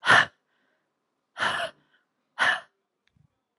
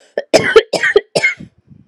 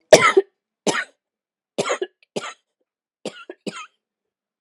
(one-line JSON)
{"exhalation_length": "3.6 s", "exhalation_amplitude": 18625, "exhalation_signal_mean_std_ratio": 0.31, "cough_length": "1.9 s", "cough_amplitude": 32768, "cough_signal_mean_std_ratio": 0.47, "three_cough_length": "4.6 s", "three_cough_amplitude": 32768, "three_cough_signal_mean_std_ratio": 0.26, "survey_phase": "alpha (2021-03-01 to 2021-08-12)", "age": "18-44", "gender": "Female", "wearing_mask": "No", "symptom_cough_any": true, "symptom_onset": "6 days", "smoker_status": "Never smoked", "respiratory_condition_asthma": false, "respiratory_condition_other": false, "recruitment_source": "REACT", "submission_delay": "2 days", "covid_test_result": "Negative", "covid_test_method": "RT-qPCR"}